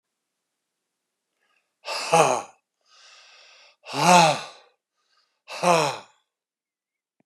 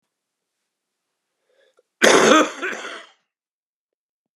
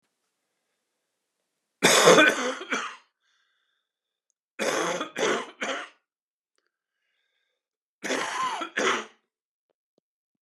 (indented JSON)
{
  "exhalation_length": "7.3 s",
  "exhalation_amplitude": 26670,
  "exhalation_signal_mean_std_ratio": 0.31,
  "cough_length": "4.4 s",
  "cough_amplitude": 32768,
  "cough_signal_mean_std_ratio": 0.29,
  "three_cough_length": "10.4 s",
  "three_cough_amplitude": 24234,
  "three_cough_signal_mean_std_ratio": 0.35,
  "survey_phase": "beta (2021-08-13 to 2022-03-07)",
  "age": "65+",
  "gender": "Male",
  "wearing_mask": "No",
  "symptom_cough_any": true,
  "symptom_sore_throat": true,
  "symptom_fatigue": true,
  "symptom_headache": true,
  "symptom_onset": "5 days",
  "smoker_status": "Never smoked",
  "respiratory_condition_asthma": false,
  "respiratory_condition_other": false,
  "recruitment_source": "Test and Trace",
  "submission_delay": "2 days",
  "covid_test_result": "Positive",
  "covid_test_method": "RT-qPCR",
  "covid_ct_value": 15.8,
  "covid_ct_gene": "ORF1ab gene",
  "covid_ct_mean": 16.4,
  "covid_viral_load": "4300000 copies/ml",
  "covid_viral_load_category": "High viral load (>1M copies/ml)"
}